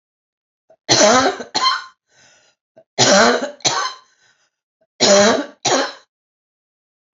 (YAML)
three_cough_length: 7.2 s
three_cough_amplitude: 32674
three_cough_signal_mean_std_ratio: 0.44
survey_phase: beta (2021-08-13 to 2022-03-07)
age: 45-64
gender: Female
wearing_mask: 'No'
symptom_cough_any: true
symptom_runny_or_blocked_nose: true
symptom_fatigue: true
symptom_headache: true
symptom_onset: 2 days
smoker_status: Current smoker (e-cigarettes or vapes only)
respiratory_condition_asthma: false
respiratory_condition_other: false
recruitment_source: Test and Trace
submission_delay: 2 days
covid_test_result: Positive
covid_test_method: ePCR